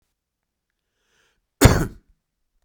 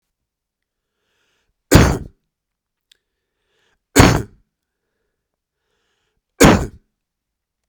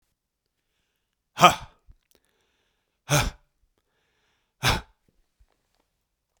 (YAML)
cough_length: 2.6 s
cough_amplitude: 32768
cough_signal_mean_std_ratio: 0.21
three_cough_length: 7.7 s
three_cough_amplitude: 32768
three_cough_signal_mean_std_ratio: 0.24
exhalation_length: 6.4 s
exhalation_amplitude: 32767
exhalation_signal_mean_std_ratio: 0.19
survey_phase: beta (2021-08-13 to 2022-03-07)
age: 45-64
gender: Male
wearing_mask: 'No'
symptom_runny_or_blocked_nose: true
smoker_status: Never smoked
respiratory_condition_asthma: false
respiratory_condition_other: false
recruitment_source: REACT
submission_delay: 1 day
covid_test_result: Negative
covid_test_method: RT-qPCR
influenza_a_test_result: Negative
influenza_b_test_result: Negative